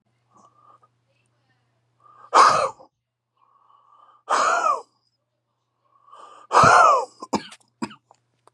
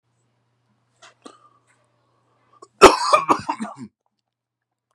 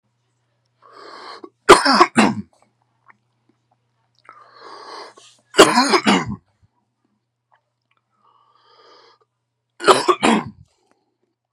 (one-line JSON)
{"exhalation_length": "8.5 s", "exhalation_amplitude": 28509, "exhalation_signal_mean_std_ratio": 0.33, "cough_length": "4.9 s", "cough_amplitude": 32768, "cough_signal_mean_std_ratio": 0.22, "three_cough_length": "11.5 s", "three_cough_amplitude": 32768, "three_cough_signal_mean_std_ratio": 0.29, "survey_phase": "beta (2021-08-13 to 2022-03-07)", "age": "18-44", "gender": "Male", "wearing_mask": "No", "symptom_cough_any": true, "symptom_runny_or_blocked_nose": true, "symptom_shortness_of_breath": true, "symptom_sore_throat": true, "symptom_onset": "12 days", "smoker_status": "Never smoked", "respiratory_condition_asthma": true, "respiratory_condition_other": true, "recruitment_source": "REACT", "submission_delay": "1 day", "covid_test_result": "Negative", "covid_test_method": "RT-qPCR", "influenza_a_test_result": "Negative", "influenza_b_test_result": "Negative"}